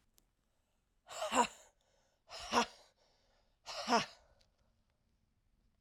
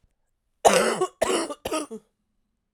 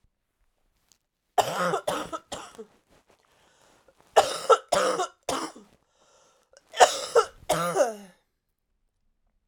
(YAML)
exhalation_length: 5.8 s
exhalation_amplitude: 3910
exhalation_signal_mean_std_ratio: 0.29
cough_length: 2.7 s
cough_amplitude: 26469
cough_signal_mean_std_ratio: 0.42
three_cough_length: 9.5 s
three_cough_amplitude: 31432
three_cough_signal_mean_std_ratio: 0.34
survey_phase: beta (2021-08-13 to 2022-03-07)
age: 45-64
gender: Female
wearing_mask: 'No'
symptom_cough_any: true
symptom_runny_or_blocked_nose: true
symptom_sore_throat: true
symptom_diarrhoea: true
symptom_fatigue: true
symptom_fever_high_temperature: true
symptom_headache: true
symptom_change_to_sense_of_smell_or_taste: true
symptom_loss_of_taste: true
symptom_onset: 6 days
smoker_status: Never smoked
respiratory_condition_asthma: false
respiratory_condition_other: false
recruitment_source: Test and Trace
submission_delay: 4 days
covid_test_result: Positive
covid_test_method: RT-qPCR
covid_ct_value: 19.3
covid_ct_gene: ORF1ab gene
covid_ct_mean: 19.9
covid_viral_load: 300000 copies/ml
covid_viral_load_category: Low viral load (10K-1M copies/ml)